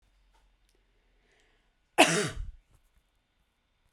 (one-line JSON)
{"cough_length": "3.9 s", "cough_amplitude": 18697, "cough_signal_mean_std_ratio": 0.22, "survey_phase": "beta (2021-08-13 to 2022-03-07)", "age": "18-44", "gender": "Female", "wearing_mask": "No", "symptom_none": true, "symptom_onset": "13 days", "smoker_status": "Never smoked", "respiratory_condition_asthma": false, "respiratory_condition_other": false, "recruitment_source": "REACT", "submission_delay": "0 days", "covid_test_result": "Negative", "covid_test_method": "RT-qPCR"}